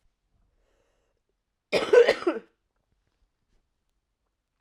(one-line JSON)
{"cough_length": "4.6 s", "cough_amplitude": 17593, "cough_signal_mean_std_ratio": 0.23, "survey_phase": "alpha (2021-03-01 to 2021-08-12)", "age": "18-44", "gender": "Female", "wearing_mask": "No", "symptom_cough_any": true, "symptom_new_continuous_cough": true, "symptom_fatigue": true, "symptom_headache": true, "symptom_onset": "2 days", "smoker_status": "Never smoked", "respiratory_condition_asthma": true, "respiratory_condition_other": false, "recruitment_source": "Test and Trace", "submission_delay": "1 day", "covid_test_result": "Positive", "covid_test_method": "RT-qPCR", "covid_ct_value": 26.9, "covid_ct_gene": "ORF1ab gene", "covid_ct_mean": 27.8, "covid_viral_load": "790 copies/ml", "covid_viral_load_category": "Minimal viral load (< 10K copies/ml)"}